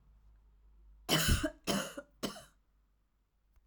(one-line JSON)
{"cough_length": "3.7 s", "cough_amplitude": 5520, "cough_signal_mean_std_ratio": 0.38, "survey_phase": "alpha (2021-03-01 to 2021-08-12)", "age": "45-64", "gender": "Female", "wearing_mask": "No", "symptom_cough_any": true, "symptom_fatigue": true, "symptom_onset": "12 days", "smoker_status": "Never smoked", "respiratory_condition_asthma": false, "respiratory_condition_other": false, "recruitment_source": "REACT", "submission_delay": "1 day", "covid_test_result": "Negative", "covid_test_method": "RT-qPCR"}